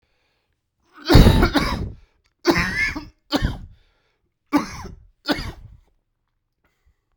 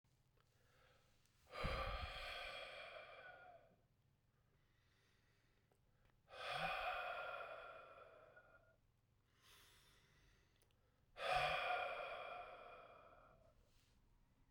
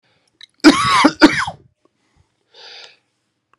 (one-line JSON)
{"three_cough_length": "7.2 s", "three_cough_amplitude": 32768, "three_cough_signal_mean_std_ratio": 0.35, "exhalation_length": "14.5 s", "exhalation_amplitude": 1255, "exhalation_signal_mean_std_ratio": 0.48, "cough_length": "3.6 s", "cough_amplitude": 32768, "cough_signal_mean_std_ratio": 0.33, "survey_phase": "beta (2021-08-13 to 2022-03-07)", "age": "18-44", "gender": "Male", "wearing_mask": "No", "symptom_new_continuous_cough": true, "symptom_runny_or_blocked_nose": true, "symptom_sore_throat": true, "symptom_fatigue": true, "symptom_headache": true, "symptom_change_to_sense_of_smell_or_taste": true, "symptom_onset": "3 days", "smoker_status": "Never smoked", "respiratory_condition_asthma": false, "respiratory_condition_other": false, "recruitment_source": "Test and Trace", "submission_delay": "2 days", "covid_test_result": "Positive", "covid_test_method": "RT-qPCR"}